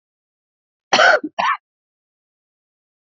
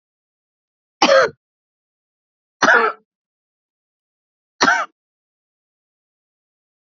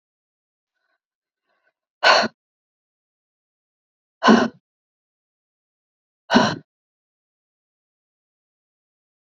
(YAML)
cough_length: 3.1 s
cough_amplitude: 29080
cough_signal_mean_std_ratio: 0.3
three_cough_length: 7.0 s
three_cough_amplitude: 32767
three_cough_signal_mean_std_ratio: 0.26
exhalation_length: 9.2 s
exhalation_amplitude: 27777
exhalation_signal_mean_std_ratio: 0.21
survey_phase: beta (2021-08-13 to 2022-03-07)
age: 45-64
gender: Female
wearing_mask: 'No'
symptom_cough_any: true
smoker_status: Never smoked
respiratory_condition_asthma: false
respiratory_condition_other: false
recruitment_source: REACT
submission_delay: 2 days
covid_test_result: Negative
covid_test_method: RT-qPCR
influenza_a_test_result: Negative
influenza_b_test_result: Negative